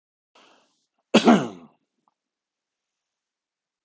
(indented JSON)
{
  "cough_length": "3.8 s",
  "cough_amplitude": 25020,
  "cough_signal_mean_std_ratio": 0.2,
  "survey_phase": "beta (2021-08-13 to 2022-03-07)",
  "age": "45-64",
  "gender": "Male",
  "wearing_mask": "No",
  "symptom_none": true,
  "symptom_onset": "6 days",
  "smoker_status": "Ex-smoker",
  "respiratory_condition_asthma": true,
  "respiratory_condition_other": false,
  "recruitment_source": "REACT",
  "submission_delay": "3 days",
  "covid_test_result": "Negative",
  "covid_test_method": "RT-qPCR"
}